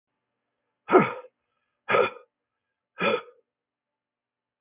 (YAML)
exhalation_length: 4.6 s
exhalation_amplitude: 24062
exhalation_signal_mean_std_ratio: 0.27
survey_phase: beta (2021-08-13 to 2022-03-07)
age: 65+
gender: Male
wearing_mask: 'No'
symptom_none: true
smoker_status: Never smoked
respiratory_condition_asthma: false
respiratory_condition_other: false
recruitment_source: REACT
submission_delay: 1 day
covid_test_result: Negative
covid_test_method: RT-qPCR
influenza_a_test_result: Negative
influenza_b_test_result: Negative